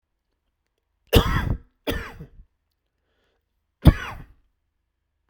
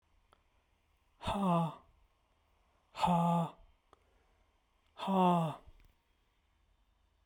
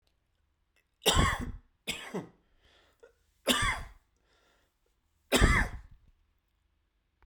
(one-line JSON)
{"cough_length": "5.3 s", "cough_amplitude": 32768, "cough_signal_mean_std_ratio": 0.24, "exhalation_length": "7.3 s", "exhalation_amplitude": 4333, "exhalation_signal_mean_std_ratio": 0.39, "three_cough_length": "7.3 s", "three_cough_amplitude": 13093, "three_cough_signal_mean_std_ratio": 0.33, "survey_phase": "alpha (2021-03-01 to 2021-08-12)", "age": "65+", "gender": "Male", "wearing_mask": "No", "symptom_cough_any": true, "symptom_onset": "8 days", "smoker_status": "Never smoked", "respiratory_condition_asthma": true, "respiratory_condition_other": false, "recruitment_source": "Test and Trace", "submission_delay": "1 day", "covid_test_result": "Positive", "covid_test_method": "RT-qPCR", "covid_ct_value": 16.9, "covid_ct_gene": "ORF1ab gene", "covid_ct_mean": 17.3, "covid_viral_load": "2100000 copies/ml", "covid_viral_load_category": "High viral load (>1M copies/ml)"}